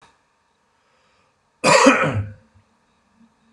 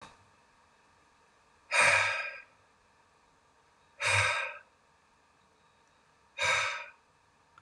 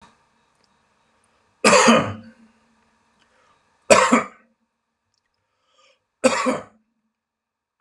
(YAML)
cough_length: 3.5 s
cough_amplitude: 32388
cough_signal_mean_std_ratio: 0.32
exhalation_length: 7.6 s
exhalation_amplitude: 7352
exhalation_signal_mean_std_ratio: 0.37
three_cough_length: 7.8 s
three_cough_amplitude: 32768
three_cough_signal_mean_std_ratio: 0.29
survey_phase: beta (2021-08-13 to 2022-03-07)
age: 45-64
gender: Male
wearing_mask: 'No'
symptom_none: true
symptom_onset: 12 days
smoker_status: Ex-smoker
respiratory_condition_asthma: false
respiratory_condition_other: false
recruitment_source: REACT
submission_delay: 10 days
covid_test_result: Negative
covid_test_method: RT-qPCR